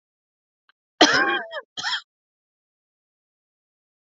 {"cough_length": "4.0 s", "cough_amplitude": 27932, "cough_signal_mean_std_ratio": 0.28, "survey_phase": "alpha (2021-03-01 to 2021-08-12)", "age": "18-44", "gender": "Female", "wearing_mask": "No", "symptom_cough_any": true, "symptom_new_continuous_cough": true, "symptom_shortness_of_breath": true, "symptom_fatigue": true, "symptom_fever_high_temperature": true, "symptom_headache": true, "symptom_change_to_sense_of_smell_or_taste": true, "symptom_loss_of_taste": true, "symptom_onset": "4 days", "smoker_status": "Ex-smoker", "respiratory_condition_asthma": true, "respiratory_condition_other": false, "recruitment_source": "Test and Trace", "submission_delay": "2 days", "covid_test_result": "Positive", "covid_test_method": "RT-qPCR"}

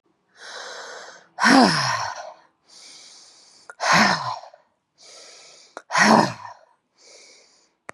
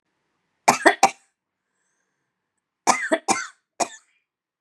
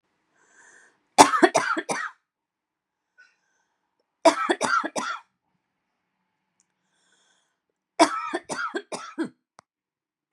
{"exhalation_length": "7.9 s", "exhalation_amplitude": 28567, "exhalation_signal_mean_std_ratio": 0.38, "cough_length": "4.6 s", "cough_amplitude": 32767, "cough_signal_mean_std_ratio": 0.27, "three_cough_length": "10.3 s", "three_cough_amplitude": 32768, "three_cough_signal_mean_std_ratio": 0.28, "survey_phase": "beta (2021-08-13 to 2022-03-07)", "age": "45-64", "gender": "Female", "wearing_mask": "No", "symptom_sore_throat": true, "symptom_headache": true, "symptom_onset": "3 days", "smoker_status": "Never smoked", "respiratory_condition_asthma": false, "respiratory_condition_other": false, "recruitment_source": "Test and Trace", "submission_delay": "2 days", "covid_test_result": "Positive", "covid_test_method": "LAMP"}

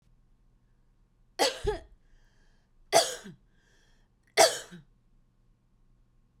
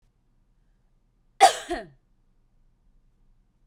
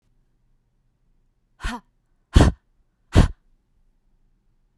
{"three_cough_length": "6.4 s", "three_cough_amplitude": 14681, "three_cough_signal_mean_std_ratio": 0.25, "cough_length": "3.7 s", "cough_amplitude": 23738, "cough_signal_mean_std_ratio": 0.18, "exhalation_length": "4.8 s", "exhalation_amplitude": 32767, "exhalation_signal_mean_std_ratio": 0.21, "survey_phase": "beta (2021-08-13 to 2022-03-07)", "age": "45-64", "gender": "Female", "wearing_mask": "No", "symptom_none": true, "smoker_status": "Ex-smoker", "respiratory_condition_asthma": false, "respiratory_condition_other": false, "recruitment_source": "REACT", "submission_delay": "1 day", "covid_test_result": "Negative", "covid_test_method": "RT-qPCR", "influenza_a_test_result": "Negative", "influenza_b_test_result": "Negative"}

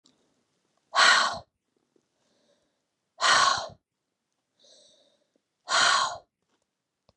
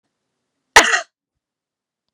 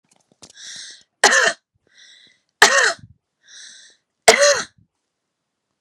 {"exhalation_length": "7.2 s", "exhalation_amplitude": 15326, "exhalation_signal_mean_std_ratio": 0.34, "cough_length": "2.1 s", "cough_amplitude": 32768, "cough_signal_mean_std_ratio": 0.22, "three_cough_length": "5.8 s", "three_cough_amplitude": 32768, "three_cough_signal_mean_std_ratio": 0.32, "survey_phase": "beta (2021-08-13 to 2022-03-07)", "age": "45-64", "gender": "Female", "wearing_mask": "No", "symptom_none": true, "smoker_status": "Never smoked", "respiratory_condition_asthma": false, "respiratory_condition_other": false, "recruitment_source": "Test and Trace", "submission_delay": "1 day", "covid_test_result": "Negative", "covid_test_method": "RT-qPCR"}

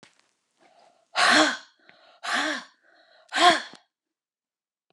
{"exhalation_length": "4.9 s", "exhalation_amplitude": 21160, "exhalation_signal_mean_std_ratio": 0.35, "survey_phase": "beta (2021-08-13 to 2022-03-07)", "age": "45-64", "gender": "Female", "wearing_mask": "No", "symptom_cough_any": true, "symptom_runny_or_blocked_nose": true, "symptom_fatigue": true, "symptom_headache": true, "symptom_onset": "3 days", "smoker_status": "Ex-smoker", "respiratory_condition_asthma": false, "respiratory_condition_other": false, "recruitment_source": "REACT", "submission_delay": "1 day", "covid_test_result": "Negative", "covid_test_method": "RT-qPCR"}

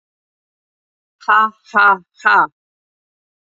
{"exhalation_length": "3.5 s", "exhalation_amplitude": 30498, "exhalation_signal_mean_std_ratio": 0.35, "survey_phase": "beta (2021-08-13 to 2022-03-07)", "age": "45-64", "gender": "Female", "wearing_mask": "No", "symptom_runny_or_blocked_nose": true, "symptom_shortness_of_breath": true, "symptom_fatigue": true, "symptom_headache": true, "symptom_change_to_sense_of_smell_or_taste": true, "smoker_status": "Never smoked", "respiratory_condition_asthma": false, "respiratory_condition_other": false, "recruitment_source": "Test and Trace", "submission_delay": "3 days", "covid_test_result": "Positive", "covid_test_method": "RT-qPCR", "covid_ct_value": 15.5, "covid_ct_gene": "ORF1ab gene", "covid_ct_mean": 15.9, "covid_viral_load": "6300000 copies/ml", "covid_viral_load_category": "High viral load (>1M copies/ml)"}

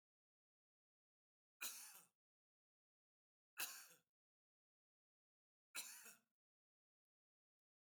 {"three_cough_length": "7.8 s", "three_cough_amplitude": 1570, "three_cough_signal_mean_std_ratio": 0.24, "survey_phase": "beta (2021-08-13 to 2022-03-07)", "age": "65+", "gender": "Male", "wearing_mask": "No", "symptom_runny_or_blocked_nose": true, "smoker_status": "Ex-smoker", "respiratory_condition_asthma": false, "respiratory_condition_other": false, "recruitment_source": "REACT", "submission_delay": "1 day", "covid_test_result": "Negative", "covid_test_method": "RT-qPCR", "influenza_a_test_result": "Negative", "influenza_b_test_result": "Negative"}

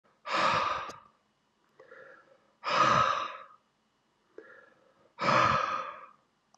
{"exhalation_length": "6.6 s", "exhalation_amplitude": 7847, "exhalation_signal_mean_std_ratio": 0.46, "survey_phase": "beta (2021-08-13 to 2022-03-07)", "age": "18-44", "gender": "Male", "wearing_mask": "No", "symptom_cough_any": true, "symptom_runny_or_blocked_nose": true, "symptom_headache": true, "smoker_status": "Never smoked", "respiratory_condition_asthma": false, "respiratory_condition_other": false, "recruitment_source": "Test and Trace", "submission_delay": "1 day", "covid_test_result": "Positive", "covid_test_method": "LFT"}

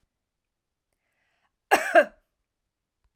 {"cough_length": "3.2 s", "cough_amplitude": 19226, "cough_signal_mean_std_ratio": 0.21, "survey_phase": "alpha (2021-03-01 to 2021-08-12)", "age": "45-64", "gender": "Female", "wearing_mask": "No", "symptom_none": true, "smoker_status": "Ex-smoker", "respiratory_condition_asthma": false, "respiratory_condition_other": false, "recruitment_source": "REACT", "submission_delay": "2 days", "covid_test_result": "Negative", "covid_test_method": "RT-qPCR"}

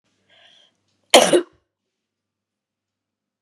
{"cough_length": "3.4 s", "cough_amplitude": 32768, "cough_signal_mean_std_ratio": 0.21, "survey_phase": "beta (2021-08-13 to 2022-03-07)", "age": "45-64", "gender": "Female", "wearing_mask": "No", "symptom_cough_any": true, "symptom_sore_throat": true, "symptom_abdominal_pain": true, "symptom_fatigue": true, "symptom_headache": true, "symptom_change_to_sense_of_smell_or_taste": true, "symptom_loss_of_taste": true, "symptom_onset": "2 days", "smoker_status": "Ex-smoker", "respiratory_condition_asthma": false, "respiratory_condition_other": false, "recruitment_source": "Test and Trace", "submission_delay": "2 days", "covid_test_result": "Positive", "covid_test_method": "RT-qPCR", "covid_ct_value": 17.3, "covid_ct_gene": "ORF1ab gene", "covid_ct_mean": 18.3, "covid_viral_load": "970000 copies/ml", "covid_viral_load_category": "Low viral load (10K-1M copies/ml)"}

